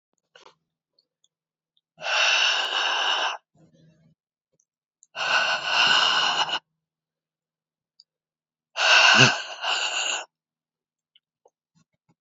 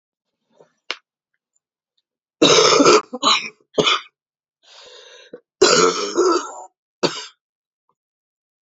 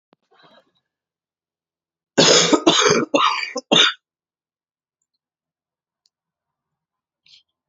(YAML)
exhalation_length: 12.2 s
exhalation_amplitude: 27998
exhalation_signal_mean_std_ratio: 0.44
cough_length: 8.6 s
cough_amplitude: 31657
cough_signal_mean_std_ratio: 0.38
three_cough_length: 7.7 s
three_cough_amplitude: 31378
three_cough_signal_mean_std_ratio: 0.33
survey_phase: alpha (2021-03-01 to 2021-08-12)
age: 45-64
gender: Female
wearing_mask: 'No'
symptom_cough_any: true
symptom_new_continuous_cough: true
symptom_shortness_of_breath: true
symptom_abdominal_pain: true
symptom_fatigue: true
symptom_fever_high_temperature: true
symptom_headache: true
symptom_change_to_sense_of_smell_or_taste: true
symptom_loss_of_taste: true
symptom_onset: 8 days
smoker_status: Current smoker (1 to 10 cigarettes per day)
respiratory_condition_asthma: false
respiratory_condition_other: false
recruitment_source: Test and Trace
submission_delay: 1 day
covid_test_result: Positive
covid_test_method: RT-qPCR
covid_ct_value: 18.0
covid_ct_gene: ORF1ab gene
covid_ct_mean: 18.4
covid_viral_load: 910000 copies/ml
covid_viral_load_category: Low viral load (10K-1M copies/ml)